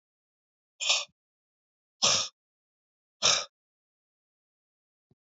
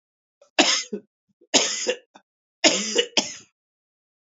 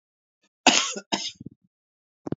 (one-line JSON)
{"exhalation_length": "5.2 s", "exhalation_amplitude": 12225, "exhalation_signal_mean_std_ratio": 0.27, "three_cough_length": "4.3 s", "three_cough_amplitude": 28284, "three_cough_signal_mean_std_ratio": 0.38, "cough_length": "2.4 s", "cough_amplitude": 25997, "cough_signal_mean_std_ratio": 0.29, "survey_phase": "beta (2021-08-13 to 2022-03-07)", "age": "45-64", "gender": "Male", "wearing_mask": "No", "symptom_cough_any": true, "symptom_runny_or_blocked_nose": true, "symptom_sore_throat": true, "symptom_fatigue": true, "smoker_status": "Never smoked", "respiratory_condition_asthma": false, "respiratory_condition_other": false, "recruitment_source": "Test and Trace", "submission_delay": "2 days", "covid_test_result": "Positive", "covid_test_method": "LFT"}